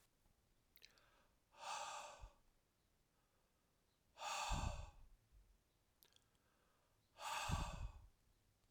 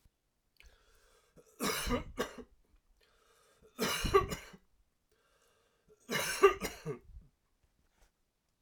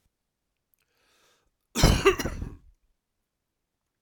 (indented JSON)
{
  "exhalation_length": "8.7 s",
  "exhalation_amplitude": 1132,
  "exhalation_signal_mean_std_ratio": 0.42,
  "three_cough_length": "8.6 s",
  "three_cough_amplitude": 7579,
  "three_cough_signal_mean_std_ratio": 0.32,
  "cough_length": "4.0 s",
  "cough_amplitude": 19674,
  "cough_signal_mean_std_ratio": 0.26,
  "survey_phase": "alpha (2021-03-01 to 2021-08-12)",
  "age": "45-64",
  "gender": "Male",
  "wearing_mask": "No",
  "symptom_none": true,
  "smoker_status": "Never smoked",
  "respiratory_condition_asthma": false,
  "respiratory_condition_other": false,
  "recruitment_source": "REACT",
  "submission_delay": "1 day",
  "covid_test_result": "Negative",
  "covid_test_method": "RT-qPCR"
}